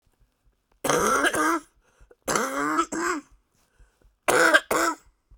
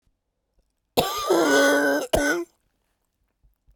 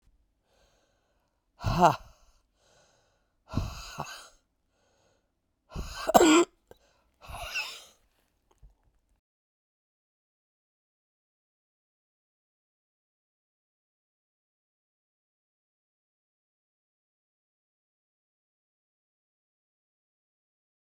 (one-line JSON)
{"three_cough_length": "5.4 s", "three_cough_amplitude": 23805, "three_cough_signal_mean_std_ratio": 0.52, "cough_length": "3.8 s", "cough_amplitude": 22155, "cough_signal_mean_std_ratio": 0.51, "exhalation_length": "20.9 s", "exhalation_amplitude": 20561, "exhalation_signal_mean_std_ratio": 0.17, "survey_phase": "beta (2021-08-13 to 2022-03-07)", "age": "45-64", "gender": "Female", "wearing_mask": "No", "symptom_cough_any": true, "symptom_runny_or_blocked_nose": true, "symptom_shortness_of_breath": true, "symptom_sore_throat": true, "symptom_fatigue": true, "symptom_fever_high_temperature": true, "symptom_headache": true, "symptom_change_to_sense_of_smell_or_taste": true, "symptom_loss_of_taste": true, "smoker_status": "Ex-smoker", "respiratory_condition_asthma": false, "respiratory_condition_other": false, "recruitment_source": "Test and Trace", "submission_delay": "2 days", "covid_test_result": "Positive", "covid_test_method": "LFT"}